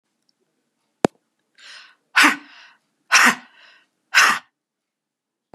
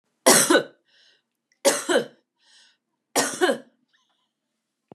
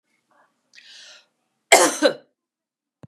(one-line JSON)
{"exhalation_length": "5.5 s", "exhalation_amplitude": 32768, "exhalation_signal_mean_std_ratio": 0.28, "three_cough_length": "4.9 s", "three_cough_amplitude": 32277, "three_cough_signal_mean_std_ratio": 0.34, "cough_length": "3.1 s", "cough_amplitude": 32768, "cough_signal_mean_std_ratio": 0.25, "survey_phase": "beta (2021-08-13 to 2022-03-07)", "age": "65+", "gender": "Female", "wearing_mask": "No", "symptom_abdominal_pain": true, "symptom_diarrhoea": true, "smoker_status": "Never smoked", "respiratory_condition_asthma": false, "respiratory_condition_other": false, "recruitment_source": "REACT", "submission_delay": "2 days", "covid_test_result": "Negative", "covid_test_method": "RT-qPCR", "influenza_a_test_result": "Negative", "influenza_b_test_result": "Negative"}